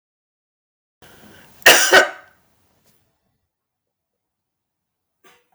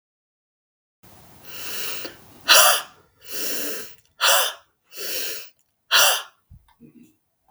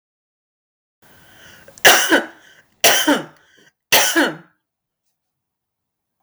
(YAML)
cough_length: 5.5 s
cough_amplitude: 32768
cough_signal_mean_std_ratio: 0.22
exhalation_length: 7.5 s
exhalation_amplitude: 32768
exhalation_signal_mean_std_ratio: 0.41
three_cough_length: 6.2 s
three_cough_amplitude: 32768
three_cough_signal_mean_std_ratio: 0.34
survey_phase: beta (2021-08-13 to 2022-03-07)
age: 45-64
gender: Female
wearing_mask: 'No'
symptom_cough_any: true
symptom_sore_throat: true
symptom_abdominal_pain: true
symptom_headache: true
smoker_status: Never smoked
respiratory_condition_asthma: false
respiratory_condition_other: false
recruitment_source: REACT
submission_delay: 1 day
covid_test_result: Negative
covid_test_method: RT-qPCR